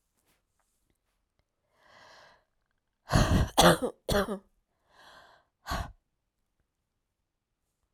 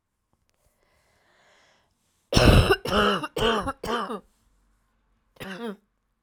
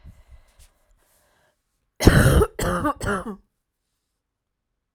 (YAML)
exhalation_length: 7.9 s
exhalation_amplitude: 16221
exhalation_signal_mean_std_ratio: 0.27
three_cough_length: 6.2 s
three_cough_amplitude: 26712
three_cough_signal_mean_std_ratio: 0.36
cough_length: 4.9 s
cough_amplitude: 32768
cough_signal_mean_std_ratio: 0.33
survey_phase: alpha (2021-03-01 to 2021-08-12)
age: 18-44
gender: Female
wearing_mask: 'No'
symptom_cough_any: true
symptom_shortness_of_breath: true
symptom_fatigue: true
symptom_headache: true
symptom_onset: 6 days
smoker_status: Never smoked
respiratory_condition_asthma: false
respiratory_condition_other: false
recruitment_source: REACT
submission_delay: 2 days
covid_test_result: Negative
covid_test_method: RT-qPCR